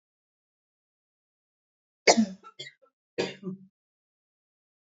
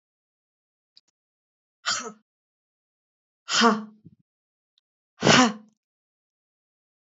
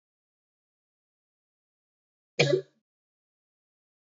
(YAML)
three_cough_length: 4.9 s
three_cough_amplitude: 19003
three_cough_signal_mean_std_ratio: 0.2
exhalation_length: 7.2 s
exhalation_amplitude: 24448
exhalation_signal_mean_std_ratio: 0.24
cough_length: 4.2 s
cough_amplitude: 13865
cough_signal_mean_std_ratio: 0.17
survey_phase: beta (2021-08-13 to 2022-03-07)
age: 45-64
gender: Female
wearing_mask: 'No'
symptom_cough_any: true
symptom_change_to_sense_of_smell_or_taste: true
symptom_onset: 13 days
smoker_status: Never smoked
respiratory_condition_asthma: false
respiratory_condition_other: false
recruitment_source: REACT
submission_delay: 4 days
covid_test_result: Negative
covid_test_method: RT-qPCR
influenza_a_test_result: Unknown/Void
influenza_b_test_result: Unknown/Void